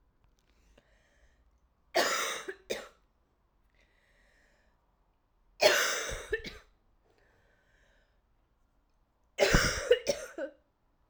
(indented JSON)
{
  "three_cough_length": "11.1 s",
  "three_cough_amplitude": 11738,
  "three_cough_signal_mean_std_ratio": 0.32,
  "survey_phase": "alpha (2021-03-01 to 2021-08-12)",
  "age": "18-44",
  "gender": "Female",
  "wearing_mask": "No",
  "symptom_cough_any": true,
  "symptom_new_continuous_cough": true,
  "symptom_shortness_of_breath": true,
  "symptom_abdominal_pain": true,
  "symptom_diarrhoea": true,
  "symptom_fatigue": true,
  "symptom_fever_high_temperature": true,
  "symptom_headache": true,
  "symptom_change_to_sense_of_smell_or_taste": true,
  "symptom_loss_of_taste": true,
  "symptom_onset": "2 days",
  "smoker_status": "Never smoked",
  "respiratory_condition_asthma": false,
  "respiratory_condition_other": false,
  "recruitment_source": "Test and Trace",
  "submission_delay": "2 days",
  "covid_test_result": "Positive",
  "covid_test_method": "RT-qPCR",
  "covid_ct_value": 22.9,
  "covid_ct_gene": "ORF1ab gene",
  "covid_ct_mean": 23.9,
  "covid_viral_load": "14000 copies/ml",
  "covid_viral_load_category": "Low viral load (10K-1M copies/ml)"
}